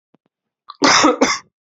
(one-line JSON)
{"cough_length": "1.8 s", "cough_amplitude": 31326, "cough_signal_mean_std_ratio": 0.44, "survey_phase": "beta (2021-08-13 to 2022-03-07)", "age": "18-44", "gender": "Male", "wearing_mask": "No", "symptom_cough_any": true, "symptom_sore_throat": true, "symptom_headache": true, "symptom_onset": "5 days", "smoker_status": "Never smoked", "respiratory_condition_asthma": false, "respiratory_condition_other": false, "recruitment_source": "Test and Trace", "submission_delay": "2 days", "covid_test_result": "Positive", "covid_test_method": "RT-qPCR", "covid_ct_value": 20.5, "covid_ct_gene": "N gene"}